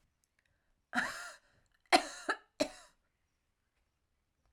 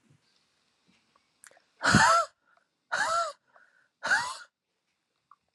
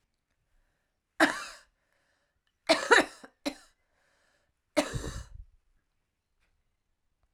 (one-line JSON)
{"cough_length": "4.5 s", "cough_amplitude": 8840, "cough_signal_mean_std_ratio": 0.24, "exhalation_length": "5.5 s", "exhalation_amplitude": 13118, "exhalation_signal_mean_std_ratio": 0.34, "three_cough_length": "7.3 s", "three_cough_amplitude": 13007, "three_cough_signal_mean_std_ratio": 0.24, "survey_phase": "alpha (2021-03-01 to 2021-08-12)", "age": "45-64", "gender": "Female", "wearing_mask": "No", "symptom_new_continuous_cough": true, "symptom_shortness_of_breath": true, "symptom_fatigue": true, "symptom_fever_high_temperature": true, "symptom_onset": "2 days", "smoker_status": "Ex-smoker", "respiratory_condition_asthma": false, "respiratory_condition_other": false, "recruitment_source": "Test and Trace", "submission_delay": "1 day", "covid_test_result": "Positive", "covid_test_method": "RT-qPCR"}